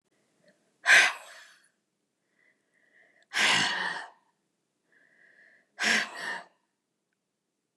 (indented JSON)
{
  "exhalation_length": "7.8 s",
  "exhalation_amplitude": 17158,
  "exhalation_signal_mean_std_ratio": 0.31,
  "survey_phase": "beta (2021-08-13 to 2022-03-07)",
  "age": "65+",
  "gender": "Female",
  "wearing_mask": "No",
  "symptom_none": true,
  "smoker_status": "Never smoked",
  "respiratory_condition_asthma": false,
  "respiratory_condition_other": false,
  "recruitment_source": "REACT",
  "submission_delay": "2 days",
  "covid_test_result": "Negative",
  "covid_test_method": "RT-qPCR",
  "influenza_a_test_result": "Negative",
  "influenza_b_test_result": "Negative"
}